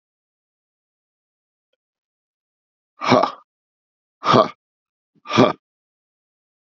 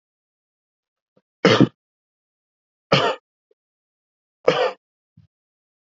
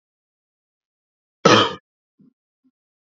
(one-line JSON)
{"exhalation_length": "6.7 s", "exhalation_amplitude": 32767, "exhalation_signal_mean_std_ratio": 0.23, "three_cough_length": "5.8 s", "three_cough_amplitude": 27977, "three_cough_signal_mean_std_ratio": 0.25, "cough_length": "3.2 s", "cough_amplitude": 28863, "cough_signal_mean_std_ratio": 0.22, "survey_phase": "beta (2021-08-13 to 2022-03-07)", "age": "18-44", "gender": "Male", "wearing_mask": "No", "symptom_cough_any": true, "symptom_sore_throat": true, "symptom_fatigue": true, "symptom_headache": true, "smoker_status": "Never smoked", "respiratory_condition_asthma": false, "respiratory_condition_other": false, "recruitment_source": "Test and Trace", "submission_delay": "1 day", "covid_test_result": "Positive", "covid_test_method": "LFT"}